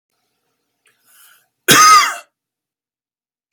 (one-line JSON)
{"cough_length": "3.5 s", "cough_amplitude": 32768, "cough_signal_mean_std_ratio": 0.3, "survey_phase": "beta (2021-08-13 to 2022-03-07)", "age": "45-64", "gender": "Male", "wearing_mask": "No", "symptom_none": true, "symptom_onset": "12 days", "smoker_status": "Never smoked", "respiratory_condition_asthma": false, "respiratory_condition_other": false, "recruitment_source": "REACT", "submission_delay": "1 day", "covid_test_result": "Negative", "covid_test_method": "RT-qPCR"}